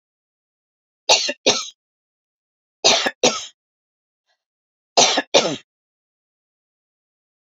{"three_cough_length": "7.4 s", "three_cough_amplitude": 32768, "three_cough_signal_mean_std_ratio": 0.3, "survey_phase": "beta (2021-08-13 to 2022-03-07)", "age": "45-64", "gender": "Female", "wearing_mask": "No", "symptom_none": true, "smoker_status": "Ex-smoker", "respiratory_condition_asthma": false, "respiratory_condition_other": false, "recruitment_source": "REACT", "submission_delay": "1 day", "covid_test_result": "Negative", "covid_test_method": "RT-qPCR"}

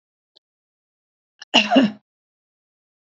{"cough_length": "3.1 s", "cough_amplitude": 29369, "cough_signal_mean_std_ratio": 0.26, "survey_phase": "beta (2021-08-13 to 2022-03-07)", "age": "45-64", "gender": "Female", "wearing_mask": "No", "symptom_none": true, "smoker_status": "Never smoked", "respiratory_condition_asthma": false, "respiratory_condition_other": false, "recruitment_source": "REACT", "submission_delay": "1 day", "covid_test_result": "Negative", "covid_test_method": "RT-qPCR", "influenza_a_test_result": "Negative", "influenza_b_test_result": "Negative"}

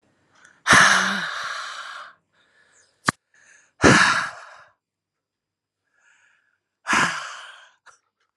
{"exhalation_length": "8.4 s", "exhalation_amplitude": 30652, "exhalation_signal_mean_std_ratio": 0.34, "survey_phase": "alpha (2021-03-01 to 2021-08-12)", "age": "18-44", "gender": "Female", "wearing_mask": "No", "symptom_cough_any": true, "symptom_shortness_of_breath": true, "symptom_fatigue": true, "symptom_headache": true, "symptom_change_to_sense_of_smell_or_taste": true, "symptom_loss_of_taste": true, "smoker_status": "Ex-smoker", "respiratory_condition_asthma": false, "respiratory_condition_other": false, "recruitment_source": "Test and Trace", "submission_delay": "2 days", "covid_test_result": "Positive", "covid_test_method": "RT-qPCR", "covid_ct_value": 18.6, "covid_ct_gene": "ORF1ab gene", "covid_ct_mean": 19.0, "covid_viral_load": "570000 copies/ml", "covid_viral_load_category": "Low viral load (10K-1M copies/ml)"}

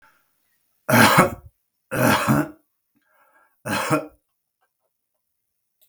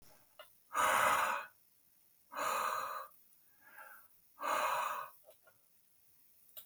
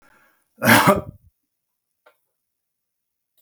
{"three_cough_length": "5.9 s", "three_cough_amplitude": 32768, "three_cough_signal_mean_std_ratio": 0.36, "exhalation_length": "6.7 s", "exhalation_amplitude": 3821, "exhalation_signal_mean_std_ratio": 0.49, "cough_length": "3.4 s", "cough_amplitude": 32768, "cough_signal_mean_std_ratio": 0.26, "survey_phase": "beta (2021-08-13 to 2022-03-07)", "age": "45-64", "gender": "Male", "wearing_mask": "No", "symptom_none": true, "smoker_status": "Ex-smoker", "respiratory_condition_asthma": false, "respiratory_condition_other": false, "recruitment_source": "REACT", "submission_delay": "1 day", "covid_test_result": "Negative", "covid_test_method": "RT-qPCR", "influenza_a_test_result": "Negative", "influenza_b_test_result": "Negative"}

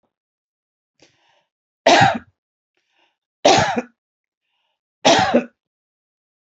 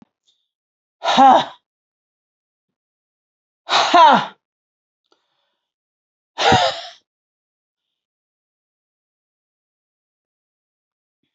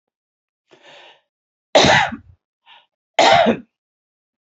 {"three_cough_length": "6.5 s", "three_cough_amplitude": 30642, "three_cough_signal_mean_std_ratio": 0.31, "exhalation_length": "11.3 s", "exhalation_amplitude": 29427, "exhalation_signal_mean_std_ratio": 0.26, "cough_length": "4.4 s", "cough_amplitude": 30025, "cough_signal_mean_std_ratio": 0.34, "survey_phase": "alpha (2021-03-01 to 2021-08-12)", "age": "65+", "gender": "Female", "wearing_mask": "No", "symptom_none": true, "smoker_status": "Never smoked", "respiratory_condition_asthma": false, "respiratory_condition_other": false, "recruitment_source": "REACT", "submission_delay": "1 day", "covid_test_result": "Negative", "covid_test_method": "RT-qPCR"}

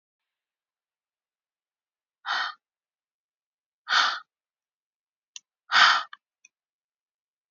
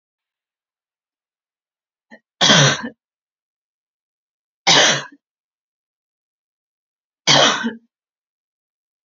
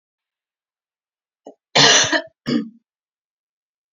{"exhalation_length": "7.5 s", "exhalation_amplitude": 20714, "exhalation_signal_mean_std_ratio": 0.24, "three_cough_length": "9.0 s", "three_cough_amplitude": 32768, "three_cough_signal_mean_std_ratio": 0.28, "cough_length": "3.9 s", "cough_amplitude": 31135, "cough_signal_mean_std_ratio": 0.3, "survey_phase": "beta (2021-08-13 to 2022-03-07)", "age": "18-44", "gender": "Female", "wearing_mask": "No", "symptom_none": true, "smoker_status": "Never smoked", "respiratory_condition_asthma": false, "respiratory_condition_other": false, "recruitment_source": "REACT", "submission_delay": "2 days", "covid_test_result": "Negative", "covid_test_method": "RT-qPCR", "influenza_a_test_result": "Negative", "influenza_b_test_result": "Negative"}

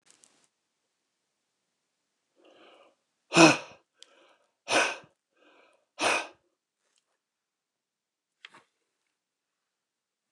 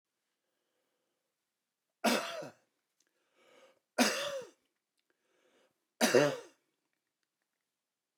{"exhalation_length": "10.3 s", "exhalation_amplitude": 24361, "exhalation_signal_mean_std_ratio": 0.18, "three_cough_length": "8.2 s", "three_cough_amplitude": 7695, "three_cough_signal_mean_std_ratio": 0.26, "survey_phase": "beta (2021-08-13 to 2022-03-07)", "age": "65+", "gender": "Male", "wearing_mask": "No", "symptom_none": true, "smoker_status": "Ex-smoker", "respiratory_condition_asthma": false, "respiratory_condition_other": false, "recruitment_source": "REACT", "submission_delay": "1 day", "covid_test_result": "Negative", "covid_test_method": "RT-qPCR"}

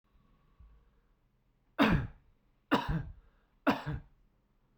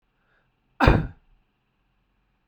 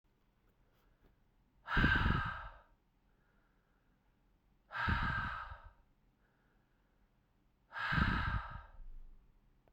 {"three_cough_length": "4.8 s", "three_cough_amplitude": 6564, "three_cough_signal_mean_std_ratio": 0.33, "cough_length": "2.5 s", "cough_amplitude": 32767, "cough_signal_mean_std_ratio": 0.23, "exhalation_length": "9.7 s", "exhalation_amplitude": 3531, "exhalation_signal_mean_std_ratio": 0.41, "survey_phase": "beta (2021-08-13 to 2022-03-07)", "age": "18-44", "gender": "Male", "wearing_mask": "No", "symptom_none": true, "smoker_status": "Ex-smoker", "respiratory_condition_asthma": false, "respiratory_condition_other": false, "recruitment_source": "REACT", "submission_delay": "1 day", "covid_test_result": "Negative", "covid_test_method": "RT-qPCR"}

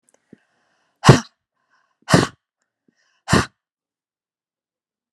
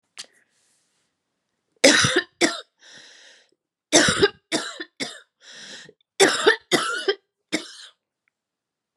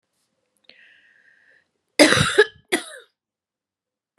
{"exhalation_length": "5.1 s", "exhalation_amplitude": 32768, "exhalation_signal_mean_std_ratio": 0.2, "three_cough_length": "9.0 s", "three_cough_amplitude": 32767, "three_cough_signal_mean_std_ratio": 0.35, "cough_length": "4.2 s", "cough_amplitude": 32767, "cough_signal_mean_std_ratio": 0.26, "survey_phase": "beta (2021-08-13 to 2022-03-07)", "age": "45-64", "gender": "Female", "wearing_mask": "No", "symptom_cough_any": true, "symptom_sore_throat": true, "symptom_headache": true, "symptom_change_to_sense_of_smell_or_taste": true, "symptom_other": true, "smoker_status": "Ex-smoker", "respiratory_condition_asthma": false, "respiratory_condition_other": false, "recruitment_source": "Test and Trace", "submission_delay": "2 days", "covid_test_result": "Positive", "covid_test_method": "RT-qPCR", "covid_ct_value": 31.2, "covid_ct_gene": "ORF1ab gene", "covid_ct_mean": 31.5, "covid_viral_load": "48 copies/ml", "covid_viral_load_category": "Minimal viral load (< 10K copies/ml)"}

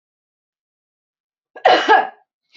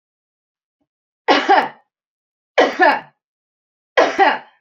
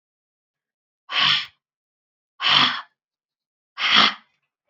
{"cough_length": "2.6 s", "cough_amplitude": 29351, "cough_signal_mean_std_ratio": 0.31, "three_cough_length": "4.6 s", "three_cough_amplitude": 32767, "three_cough_signal_mean_std_ratio": 0.38, "exhalation_length": "4.7 s", "exhalation_amplitude": 26058, "exhalation_signal_mean_std_ratio": 0.36, "survey_phase": "beta (2021-08-13 to 2022-03-07)", "age": "45-64", "gender": "Female", "wearing_mask": "No", "symptom_none": true, "smoker_status": "Never smoked", "respiratory_condition_asthma": false, "respiratory_condition_other": false, "recruitment_source": "REACT", "submission_delay": "5 days", "covid_test_result": "Negative", "covid_test_method": "RT-qPCR", "influenza_a_test_result": "Negative", "influenza_b_test_result": "Negative"}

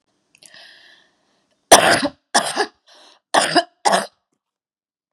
{"three_cough_length": "5.1 s", "three_cough_amplitude": 32768, "three_cough_signal_mean_std_ratio": 0.32, "survey_phase": "beta (2021-08-13 to 2022-03-07)", "age": "45-64", "gender": "Female", "wearing_mask": "No", "symptom_runny_or_blocked_nose": true, "symptom_fatigue": true, "smoker_status": "Never smoked", "respiratory_condition_asthma": false, "respiratory_condition_other": false, "recruitment_source": "Test and Trace", "submission_delay": "2 days", "covid_test_result": "Positive", "covid_test_method": "RT-qPCR"}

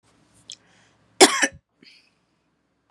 {"cough_length": "2.9 s", "cough_amplitude": 32767, "cough_signal_mean_std_ratio": 0.19, "survey_phase": "beta (2021-08-13 to 2022-03-07)", "age": "18-44", "gender": "Female", "wearing_mask": "No", "symptom_none": true, "smoker_status": "Ex-smoker", "respiratory_condition_asthma": false, "respiratory_condition_other": false, "recruitment_source": "REACT", "submission_delay": "1 day", "covid_test_result": "Negative", "covid_test_method": "RT-qPCR", "influenza_a_test_result": "Negative", "influenza_b_test_result": "Negative"}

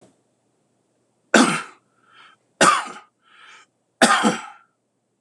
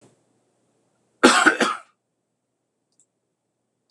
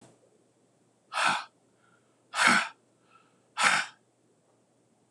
{"three_cough_length": "5.2 s", "three_cough_amplitude": 26028, "three_cough_signal_mean_std_ratio": 0.32, "cough_length": "3.9 s", "cough_amplitude": 26028, "cough_signal_mean_std_ratio": 0.25, "exhalation_length": "5.1 s", "exhalation_amplitude": 15517, "exhalation_signal_mean_std_ratio": 0.33, "survey_phase": "beta (2021-08-13 to 2022-03-07)", "age": "45-64", "gender": "Male", "wearing_mask": "No", "symptom_none": true, "symptom_onset": "12 days", "smoker_status": "Ex-smoker", "respiratory_condition_asthma": false, "respiratory_condition_other": false, "recruitment_source": "REACT", "submission_delay": "1 day", "covid_test_result": "Negative", "covid_test_method": "RT-qPCR", "influenza_a_test_result": "Negative", "influenza_b_test_result": "Negative"}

